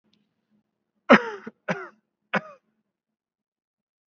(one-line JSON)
{"three_cough_length": "4.1 s", "three_cough_amplitude": 28638, "three_cough_signal_mean_std_ratio": 0.18, "survey_phase": "beta (2021-08-13 to 2022-03-07)", "age": "18-44", "gender": "Male", "wearing_mask": "Yes", "symptom_none": true, "smoker_status": "Never smoked", "respiratory_condition_asthma": false, "respiratory_condition_other": false, "recruitment_source": "REACT", "submission_delay": "1 day", "covid_test_result": "Negative", "covid_test_method": "RT-qPCR"}